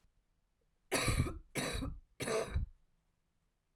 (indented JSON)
{
  "three_cough_length": "3.8 s",
  "three_cough_amplitude": 3546,
  "three_cough_signal_mean_std_ratio": 0.49,
  "survey_phase": "alpha (2021-03-01 to 2021-08-12)",
  "age": "45-64",
  "gender": "Female",
  "wearing_mask": "No",
  "symptom_cough_any": true,
  "symptom_shortness_of_breath": true,
  "symptom_fatigue": true,
  "symptom_onset": "8 days",
  "smoker_status": "Ex-smoker",
  "respiratory_condition_asthma": false,
  "respiratory_condition_other": false,
  "recruitment_source": "REACT",
  "submission_delay": "1 day",
  "covid_test_result": "Negative",
  "covid_test_method": "RT-qPCR"
}